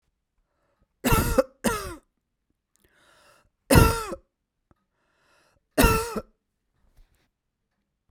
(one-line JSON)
{"three_cough_length": "8.1 s", "three_cough_amplitude": 26089, "three_cough_signal_mean_std_ratio": 0.29, "survey_phase": "beta (2021-08-13 to 2022-03-07)", "age": "45-64", "gender": "Female", "wearing_mask": "No", "symptom_cough_any": true, "symptom_fatigue": true, "symptom_headache": true, "symptom_change_to_sense_of_smell_or_taste": true, "symptom_loss_of_taste": true, "symptom_other": true, "symptom_onset": "7 days", "smoker_status": "Never smoked", "respiratory_condition_asthma": false, "respiratory_condition_other": false, "recruitment_source": "Test and Trace", "submission_delay": "5 days", "covid_test_result": "Negative", "covid_test_method": "RT-qPCR"}